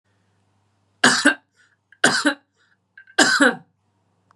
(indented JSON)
{
  "three_cough_length": "4.4 s",
  "three_cough_amplitude": 32752,
  "three_cough_signal_mean_std_ratio": 0.35,
  "survey_phase": "beta (2021-08-13 to 2022-03-07)",
  "age": "45-64",
  "gender": "Female",
  "wearing_mask": "No",
  "symptom_none": true,
  "smoker_status": "Never smoked",
  "respiratory_condition_asthma": false,
  "respiratory_condition_other": false,
  "recruitment_source": "REACT",
  "submission_delay": "5 days",
  "covid_test_result": "Negative",
  "covid_test_method": "RT-qPCR",
  "influenza_a_test_result": "Negative",
  "influenza_b_test_result": "Negative"
}